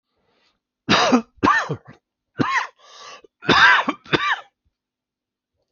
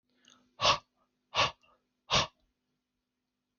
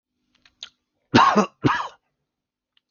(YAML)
three_cough_length: 5.7 s
three_cough_amplitude: 27803
three_cough_signal_mean_std_ratio: 0.41
exhalation_length: 3.6 s
exhalation_amplitude: 7798
exhalation_signal_mean_std_ratio: 0.28
cough_length: 2.9 s
cough_amplitude: 22473
cough_signal_mean_std_ratio: 0.32
survey_phase: beta (2021-08-13 to 2022-03-07)
age: 45-64
gender: Male
wearing_mask: 'No'
symptom_cough_any: true
smoker_status: Current smoker (11 or more cigarettes per day)
respiratory_condition_asthma: false
respiratory_condition_other: false
recruitment_source: REACT
submission_delay: 5 days
covid_test_result: Negative
covid_test_method: RT-qPCR